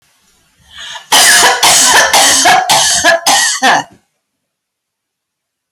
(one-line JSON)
{"cough_length": "5.7 s", "cough_amplitude": 32768, "cough_signal_mean_std_ratio": 0.68, "survey_phase": "alpha (2021-03-01 to 2021-08-12)", "age": "45-64", "gender": "Female", "wearing_mask": "No", "symptom_none": true, "smoker_status": "Ex-smoker", "respiratory_condition_asthma": false, "respiratory_condition_other": false, "recruitment_source": "REACT", "submission_delay": "1 day", "covid_test_result": "Negative", "covid_test_method": "RT-qPCR"}